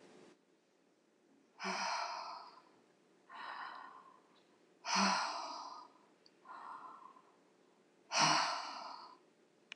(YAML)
exhalation_length: 9.8 s
exhalation_amplitude: 4364
exhalation_signal_mean_std_ratio: 0.44
survey_phase: alpha (2021-03-01 to 2021-08-12)
age: 45-64
gender: Female
wearing_mask: 'No'
symptom_none: true
smoker_status: Never smoked
respiratory_condition_asthma: false
respiratory_condition_other: false
recruitment_source: REACT
submission_delay: 3 days
covid_test_result: Negative
covid_test_method: RT-qPCR